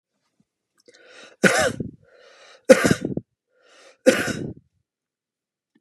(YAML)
three_cough_length: 5.8 s
three_cough_amplitude: 32768
three_cough_signal_mean_std_ratio: 0.28
survey_phase: beta (2021-08-13 to 2022-03-07)
age: 45-64
gender: Male
wearing_mask: 'No'
symptom_runny_or_blocked_nose: true
smoker_status: Ex-smoker
respiratory_condition_asthma: false
respiratory_condition_other: false
recruitment_source: REACT
submission_delay: 2 days
covid_test_result: Negative
covid_test_method: RT-qPCR
influenza_a_test_result: Negative
influenza_b_test_result: Negative